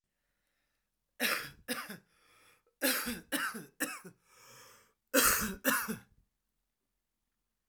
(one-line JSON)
{"cough_length": "7.7 s", "cough_amplitude": 7455, "cough_signal_mean_std_ratio": 0.38, "survey_phase": "alpha (2021-03-01 to 2021-08-12)", "age": "18-44", "gender": "Male", "wearing_mask": "No", "symptom_none": true, "symptom_cough_any": true, "symptom_new_continuous_cough": true, "symptom_fever_high_temperature": true, "symptom_headache": true, "smoker_status": "Current smoker (e-cigarettes or vapes only)", "respiratory_condition_asthma": false, "respiratory_condition_other": false, "recruitment_source": "Test and Trace", "submission_delay": "2 days", "covid_test_result": "Positive", "covid_test_method": "RT-qPCR", "covid_ct_value": 16.7, "covid_ct_gene": "ORF1ab gene", "covid_ct_mean": 17.7, "covid_viral_load": "1500000 copies/ml", "covid_viral_load_category": "High viral load (>1M copies/ml)"}